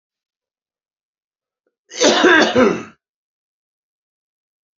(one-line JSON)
{"cough_length": "4.8 s", "cough_amplitude": 28648, "cough_signal_mean_std_ratio": 0.33, "survey_phase": "beta (2021-08-13 to 2022-03-07)", "age": "45-64", "gender": "Male", "wearing_mask": "No", "symptom_cough_any": true, "symptom_runny_or_blocked_nose": true, "smoker_status": "Current smoker (11 or more cigarettes per day)", "respiratory_condition_asthma": true, "respiratory_condition_other": false, "recruitment_source": "Test and Trace", "submission_delay": "2 days", "covid_test_result": "Positive", "covid_test_method": "RT-qPCR", "covid_ct_value": 15.7, "covid_ct_gene": "ORF1ab gene", "covid_ct_mean": 16.1, "covid_viral_load": "5400000 copies/ml", "covid_viral_load_category": "High viral load (>1M copies/ml)"}